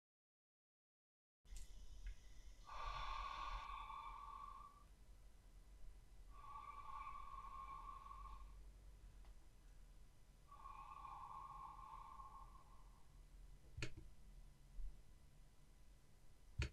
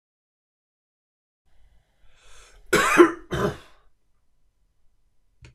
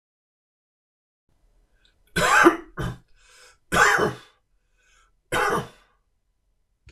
{
  "exhalation_length": "16.7 s",
  "exhalation_amplitude": 1092,
  "exhalation_signal_mean_std_ratio": 0.8,
  "cough_length": "5.5 s",
  "cough_amplitude": 25707,
  "cough_signal_mean_std_ratio": 0.25,
  "three_cough_length": "6.9 s",
  "three_cough_amplitude": 25713,
  "three_cough_signal_mean_std_ratio": 0.33,
  "survey_phase": "beta (2021-08-13 to 2022-03-07)",
  "age": "45-64",
  "gender": "Male",
  "wearing_mask": "No",
  "symptom_runny_or_blocked_nose": true,
  "symptom_sore_throat": true,
  "symptom_onset": "5 days",
  "smoker_status": "Never smoked",
  "respiratory_condition_asthma": false,
  "respiratory_condition_other": false,
  "recruitment_source": "Test and Trace",
  "submission_delay": "1 day",
  "covid_test_result": "Positive",
  "covid_test_method": "RT-qPCR",
  "covid_ct_value": 15.8,
  "covid_ct_gene": "ORF1ab gene",
  "covid_ct_mean": 16.3,
  "covid_viral_load": "4500000 copies/ml",
  "covid_viral_load_category": "High viral load (>1M copies/ml)"
}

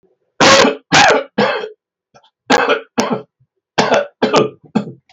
{
  "three_cough_length": "5.1 s",
  "three_cough_amplitude": 32768,
  "three_cough_signal_mean_std_ratio": 0.53,
  "survey_phase": "beta (2021-08-13 to 2022-03-07)",
  "age": "65+",
  "gender": "Male",
  "wearing_mask": "No",
  "symptom_none": true,
  "smoker_status": "Never smoked",
  "respiratory_condition_asthma": false,
  "respiratory_condition_other": false,
  "recruitment_source": "REACT",
  "submission_delay": "4 days",
  "covid_test_result": "Negative",
  "covid_test_method": "RT-qPCR"
}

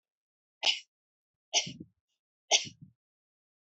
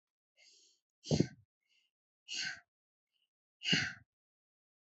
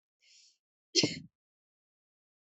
{
  "three_cough_length": "3.7 s",
  "three_cough_amplitude": 11505,
  "three_cough_signal_mean_std_ratio": 0.24,
  "exhalation_length": "4.9 s",
  "exhalation_amplitude": 5763,
  "exhalation_signal_mean_std_ratio": 0.27,
  "cough_length": "2.6 s",
  "cough_amplitude": 7892,
  "cough_signal_mean_std_ratio": 0.2,
  "survey_phase": "beta (2021-08-13 to 2022-03-07)",
  "age": "18-44",
  "gender": "Female",
  "wearing_mask": "No",
  "symptom_runny_or_blocked_nose": true,
  "symptom_fatigue": true,
  "symptom_onset": "2 days",
  "smoker_status": "Never smoked",
  "respiratory_condition_asthma": false,
  "respiratory_condition_other": false,
  "recruitment_source": "Test and Trace",
  "submission_delay": "1 day",
  "covid_test_result": "Positive",
  "covid_test_method": "RT-qPCR",
  "covid_ct_value": 14.6,
  "covid_ct_gene": "ORF1ab gene"
}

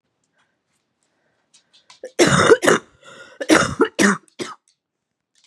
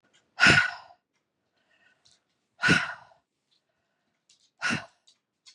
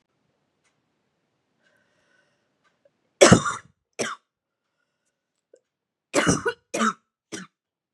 {
  "cough_length": "5.5 s",
  "cough_amplitude": 32768,
  "cough_signal_mean_std_ratio": 0.35,
  "exhalation_length": "5.5 s",
  "exhalation_amplitude": 16740,
  "exhalation_signal_mean_std_ratio": 0.28,
  "three_cough_length": "7.9 s",
  "three_cough_amplitude": 32767,
  "three_cough_signal_mean_std_ratio": 0.23,
  "survey_phase": "beta (2021-08-13 to 2022-03-07)",
  "age": "45-64",
  "gender": "Female",
  "wearing_mask": "No",
  "symptom_cough_any": true,
  "symptom_shortness_of_breath": true,
  "symptom_sore_throat": true,
  "symptom_diarrhoea": true,
  "symptom_fatigue": true,
  "symptom_headache": true,
  "symptom_change_to_sense_of_smell_or_taste": true,
  "symptom_loss_of_taste": true,
  "symptom_onset": "7 days",
  "smoker_status": "Ex-smoker",
  "respiratory_condition_asthma": true,
  "respiratory_condition_other": false,
  "recruitment_source": "Test and Trace",
  "submission_delay": "1 day",
  "covid_test_result": "Positive",
  "covid_test_method": "RT-qPCR",
  "covid_ct_value": 22.9,
  "covid_ct_gene": "ORF1ab gene"
}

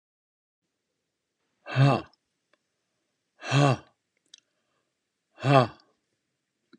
{
  "exhalation_length": "6.8 s",
  "exhalation_amplitude": 22447,
  "exhalation_signal_mean_std_ratio": 0.26,
  "survey_phase": "beta (2021-08-13 to 2022-03-07)",
  "age": "45-64",
  "gender": "Male",
  "wearing_mask": "No",
  "symptom_none": true,
  "smoker_status": "Never smoked",
  "respiratory_condition_asthma": false,
  "respiratory_condition_other": false,
  "recruitment_source": "REACT",
  "submission_delay": "2 days",
  "covid_test_result": "Negative",
  "covid_test_method": "RT-qPCR"
}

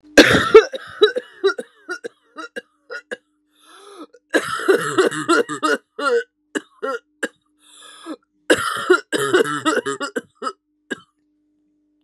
{
  "cough_length": "12.0 s",
  "cough_amplitude": 32768,
  "cough_signal_mean_std_ratio": 0.4,
  "survey_phase": "beta (2021-08-13 to 2022-03-07)",
  "age": "18-44",
  "gender": "Female",
  "wearing_mask": "No",
  "symptom_cough_any": true,
  "symptom_runny_or_blocked_nose": true,
  "symptom_sore_throat": true,
  "symptom_abdominal_pain": true,
  "symptom_diarrhoea": true,
  "symptom_fatigue": true,
  "symptom_headache": true,
  "smoker_status": "Ex-smoker",
  "respiratory_condition_asthma": true,
  "respiratory_condition_other": false,
  "recruitment_source": "Test and Trace",
  "submission_delay": "1 day",
  "covid_test_result": "Positive",
  "covid_test_method": "RT-qPCR",
  "covid_ct_value": 15.2,
  "covid_ct_gene": "ORF1ab gene"
}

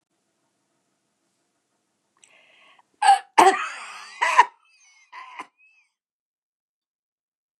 {
  "cough_length": "7.6 s",
  "cough_amplitude": 28266,
  "cough_signal_mean_std_ratio": 0.23,
  "survey_phase": "beta (2021-08-13 to 2022-03-07)",
  "age": "65+",
  "gender": "Female",
  "wearing_mask": "No",
  "symptom_none": true,
  "smoker_status": "Ex-smoker",
  "respiratory_condition_asthma": false,
  "respiratory_condition_other": false,
  "recruitment_source": "REACT",
  "submission_delay": "4 days",
  "covid_test_result": "Negative",
  "covid_test_method": "RT-qPCR",
  "influenza_a_test_result": "Negative",
  "influenza_b_test_result": "Negative"
}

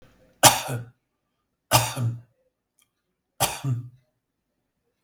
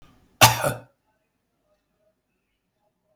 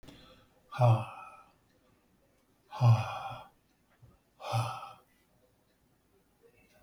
{
  "three_cough_length": "5.0 s",
  "three_cough_amplitude": 32768,
  "three_cough_signal_mean_std_ratio": 0.3,
  "cough_length": "3.2 s",
  "cough_amplitude": 32768,
  "cough_signal_mean_std_ratio": 0.2,
  "exhalation_length": "6.8 s",
  "exhalation_amplitude": 6595,
  "exhalation_signal_mean_std_ratio": 0.31,
  "survey_phase": "beta (2021-08-13 to 2022-03-07)",
  "age": "65+",
  "gender": "Male",
  "wearing_mask": "No",
  "symptom_none": true,
  "smoker_status": "Ex-smoker",
  "respiratory_condition_asthma": false,
  "respiratory_condition_other": false,
  "recruitment_source": "REACT",
  "submission_delay": "4 days",
  "covid_test_result": "Negative",
  "covid_test_method": "RT-qPCR",
  "influenza_a_test_result": "Negative",
  "influenza_b_test_result": "Negative"
}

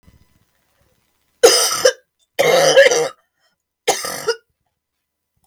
{
  "three_cough_length": "5.5 s",
  "three_cough_amplitude": 32768,
  "three_cough_signal_mean_std_ratio": 0.4,
  "survey_phase": "beta (2021-08-13 to 2022-03-07)",
  "age": "45-64",
  "gender": "Female",
  "wearing_mask": "No",
  "symptom_cough_any": true,
  "symptom_new_continuous_cough": true,
  "symptom_runny_or_blocked_nose": true,
  "symptom_sore_throat": true,
  "symptom_fatigue": true,
  "symptom_fever_high_temperature": true,
  "symptom_headache": true,
  "symptom_onset": "2 days",
  "smoker_status": "Ex-smoker",
  "respiratory_condition_asthma": false,
  "respiratory_condition_other": false,
  "recruitment_source": "Test and Trace",
  "submission_delay": "1 day",
  "covid_test_result": "Positive",
  "covid_test_method": "RT-qPCR",
  "covid_ct_value": 19.0,
  "covid_ct_gene": "N gene",
  "covid_ct_mean": 19.3,
  "covid_viral_load": "460000 copies/ml",
  "covid_viral_load_category": "Low viral load (10K-1M copies/ml)"
}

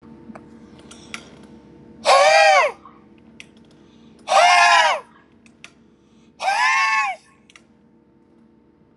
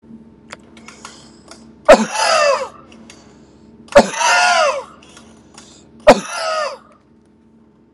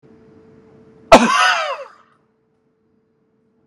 {
  "exhalation_length": "9.0 s",
  "exhalation_amplitude": 26491,
  "exhalation_signal_mean_std_ratio": 0.43,
  "three_cough_length": "7.9 s",
  "three_cough_amplitude": 32768,
  "three_cough_signal_mean_std_ratio": 0.39,
  "cough_length": "3.7 s",
  "cough_amplitude": 32768,
  "cough_signal_mean_std_ratio": 0.3,
  "survey_phase": "alpha (2021-03-01 to 2021-08-12)",
  "age": "45-64",
  "gender": "Male",
  "wearing_mask": "No",
  "symptom_none": true,
  "symptom_onset": "12 days",
  "smoker_status": "Ex-smoker",
  "respiratory_condition_asthma": false,
  "respiratory_condition_other": false,
  "recruitment_source": "REACT",
  "submission_delay": "1 day",
  "covid_test_result": "Negative",
  "covid_test_method": "RT-qPCR"
}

